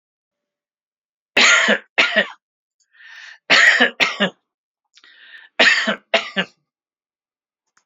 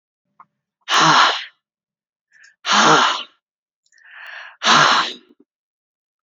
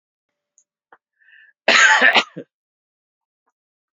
{"three_cough_length": "7.9 s", "three_cough_amplitude": 29454, "three_cough_signal_mean_std_ratio": 0.39, "exhalation_length": "6.2 s", "exhalation_amplitude": 29012, "exhalation_signal_mean_std_ratio": 0.41, "cough_length": "3.9 s", "cough_amplitude": 32619, "cough_signal_mean_std_ratio": 0.3, "survey_phase": "beta (2021-08-13 to 2022-03-07)", "age": "65+", "gender": "Male", "wearing_mask": "No", "symptom_headache": true, "symptom_onset": "13 days", "smoker_status": "Never smoked", "respiratory_condition_asthma": false, "respiratory_condition_other": false, "recruitment_source": "REACT", "submission_delay": "1 day", "covid_test_result": "Negative", "covid_test_method": "RT-qPCR", "influenza_a_test_result": "Negative", "influenza_b_test_result": "Negative"}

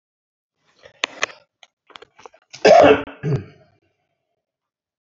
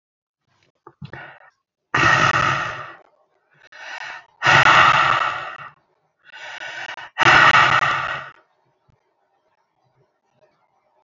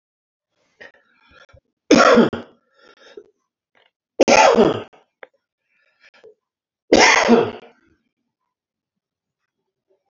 {"cough_length": "5.0 s", "cough_amplitude": 32768, "cough_signal_mean_std_ratio": 0.26, "exhalation_length": "11.1 s", "exhalation_amplitude": 29646, "exhalation_signal_mean_std_ratio": 0.41, "three_cough_length": "10.1 s", "three_cough_amplitude": 32768, "three_cough_signal_mean_std_ratio": 0.31, "survey_phase": "alpha (2021-03-01 to 2021-08-12)", "age": "65+", "gender": "Male", "wearing_mask": "No", "symptom_none": true, "smoker_status": "Never smoked", "respiratory_condition_asthma": false, "respiratory_condition_other": false, "recruitment_source": "REACT", "submission_delay": "3 days", "covid_test_result": "Negative", "covid_test_method": "RT-qPCR"}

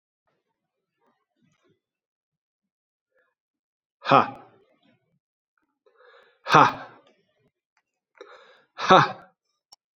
{"exhalation_length": "10.0 s", "exhalation_amplitude": 32768, "exhalation_signal_mean_std_ratio": 0.19, "survey_phase": "alpha (2021-03-01 to 2021-08-12)", "age": "18-44", "gender": "Male", "wearing_mask": "No", "symptom_cough_any": true, "symptom_diarrhoea": true, "symptom_fatigue": true, "symptom_fever_high_temperature": true, "symptom_headache": true, "symptom_change_to_sense_of_smell_or_taste": true, "symptom_loss_of_taste": true, "symptom_onset": "4 days", "smoker_status": "Never smoked", "respiratory_condition_asthma": false, "respiratory_condition_other": false, "recruitment_source": "Test and Trace", "submission_delay": "2 days", "covid_test_result": "Positive", "covid_test_method": "RT-qPCR", "covid_ct_value": 20.0, "covid_ct_gene": "N gene"}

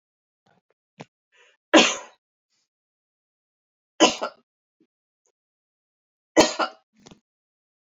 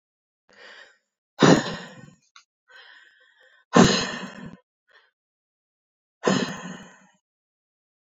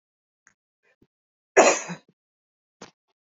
{"three_cough_length": "7.9 s", "three_cough_amplitude": 29610, "three_cough_signal_mean_std_ratio": 0.2, "exhalation_length": "8.2 s", "exhalation_amplitude": 26156, "exhalation_signal_mean_std_ratio": 0.26, "cough_length": "3.3 s", "cough_amplitude": 29537, "cough_signal_mean_std_ratio": 0.21, "survey_phase": "beta (2021-08-13 to 2022-03-07)", "age": "18-44", "gender": "Female", "wearing_mask": "No", "symptom_none": true, "smoker_status": "Never smoked", "respiratory_condition_asthma": false, "respiratory_condition_other": false, "recruitment_source": "REACT", "submission_delay": "8 days", "covid_test_result": "Negative", "covid_test_method": "RT-qPCR"}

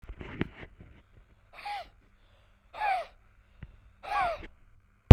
{"exhalation_length": "5.1 s", "exhalation_amplitude": 32768, "exhalation_signal_mean_std_ratio": 0.16, "survey_phase": "beta (2021-08-13 to 2022-03-07)", "age": "45-64", "gender": "Male", "wearing_mask": "No", "symptom_none": true, "smoker_status": "Ex-smoker", "respiratory_condition_asthma": true, "respiratory_condition_other": false, "recruitment_source": "REACT", "submission_delay": "1 day", "covid_test_result": "Negative", "covid_test_method": "RT-qPCR", "influenza_a_test_result": "Negative", "influenza_b_test_result": "Negative"}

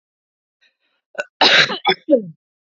{"cough_length": "2.6 s", "cough_amplitude": 30301, "cough_signal_mean_std_ratio": 0.37, "survey_phase": "beta (2021-08-13 to 2022-03-07)", "age": "18-44", "gender": "Female", "wearing_mask": "No", "symptom_none": true, "smoker_status": "Never smoked", "respiratory_condition_asthma": false, "respiratory_condition_other": false, "recruitment_source": "REACT", "submission_delay": "2 days", "covid_test_result": "Negative", "covid_test_method": "RT-qPCR", "influenza_a_test_result": "Negative", "influenza_b_test_result": "Negative"}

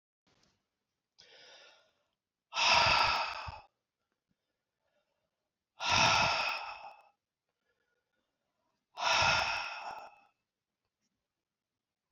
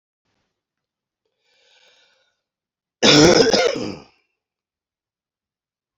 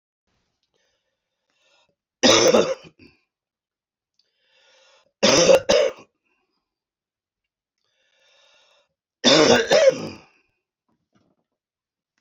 {"exhalation_length": "12.1 s", "exhalation_amplitude": 7133, "exhalation_signal_mean_std_ratio": 0.37, "cough_length": "6.0 s", "cough_amplitude": 28782, "cough_signal_mean_std_ratio": 0.29, "three_cough_length": "12.2 s", "three_cough_amplitude": 25197, "three_cough_signal_mean_std_ratio": 0.31, "survey_phase": "alpha (2021-03-01 to 2021-08-12)", "age": "45-64", "gender": "Male", "wearing_mask": "No", "symptom_cough_any": true, "symptom_fatigue": true, "symptom_onset": "4 days", "smoker_status": "Never smoked", "respiratory_condition_asthma": false, "respiratory_condition_other": false, "recruitment_source": "Test and Trace", "submission_delay": "1 day", "covid_test_result": "Positive", "covid_test_method": "RT-qPCR"}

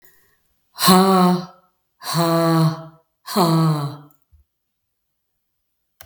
{"exhalation_length": "6.1 s", "exhalation_amplitude": 32766, "exhalation_signal_mean_std_ratio": 0.49, "survey_phase": "beta (2021-08-13 to 2022-03-07)", "age": "45-64", "gender": "Female", "wearing_mask": "No", "symptom_none": true, "smoker_status": "Never smoked", "respiratory_condition_asthma": true, "respiratory_condition_other": true, "recruitment_source": "REACT", "submission_delay": "21 days", "covid_test_result": "Negative", "covid_test_method": "RT-qPCR", "influenza_a_test_result": "Negative", "influenza_b_test_result": "Negative"}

